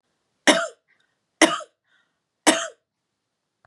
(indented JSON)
{
  "three_cough_length": "3.7 s",
  "three_cough_amplitude": 32767,
  "three_cough_signal_mean_std_ratio": 0.26,
  "survey_phase": "beta (2021-08-13 to 2022-03-07)",
  "age": "45-64",
  "gender": "Female",
  "wearing_mask": "No",
  "symptom_other": true,
  "symptom_onset": "12 days",
  "smoker_status": "Ex-smoker",
  "respiratory_condition_asthma": false,
  "respiratory_condition_other": false,
  "recruitment_source": "REACT",
  "submission_delay": "2 days",
  "covid_test_result": "Negative",
  "covid_test_method": "RT-qPCR",
  "influenza_a_test_result": "Negative",
  "influenza_b_test_result": "Negative"
}